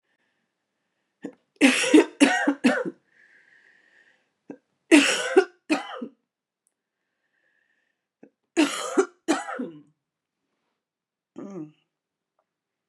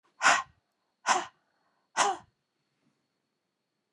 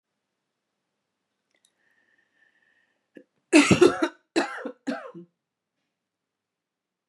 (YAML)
three_cough_length: 12.9 s
three_cough_amplitude: 28396
three_cough_signal_mean_std_ratio: 0.31
exhalation_length: 3.9 s
exhalation_amplitude: 11991
exhalation_signal_mean_std_ratio: 0.29
cough_length: 7.1 s
cough_amplitude: 23493
cough_signal_mean_std_ratio: 0.23
survey_phase: beta (2021-08-13 to 2022-03-07)
age: 45-64
gender: Female
wearing_mask: 'No'
symptom_cough_any: true
symptom_runny_or_blocked_nose: true
symptom_other: true
symptom_onset: 3 days
smoker_status: Never smoked
respiratory_condition_asthma: false
respiratory_condition_other: false
recruitment_source: Test and Trace
submission_delay: 1 day
covid_test_result: Positive
covid_test_method: ePCR